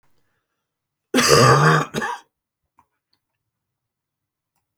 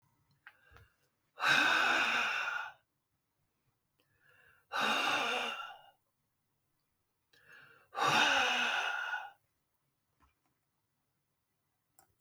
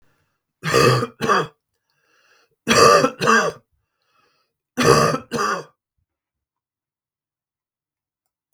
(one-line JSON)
{"cough_length": "4.8 s", "cough_amplitude": 32766, "cough_signal_mean_std_ratio": 0.34, "exhalation_length": "12.2 s", "exhalation_amplitude": 5702, "exhalation_signal_mean_std_ratio": 0.44, "three_cough_length": "8.5 s", "three_cough_amplitude": 32766, "three_cough_signal_mean_std_ratio": 0.38, "survey_phase": "beta (2021-08-13 to 2022-03-07)", "age": "65+", "gender": "Male", "wearing_mask": "No", "symptom_none": true, "smoker_status": "Never smoked", "respiratory_condition_asthma": false, "respiratory_condition_other": false, "recruitment_source": "REACT", "submission_delay": "3 days", "covid_test_result": "Negative", "covid_test_method": "RT-qPCR", "influenza_a_test_result": "Negative", "influenza_b_test_result": "Negative"}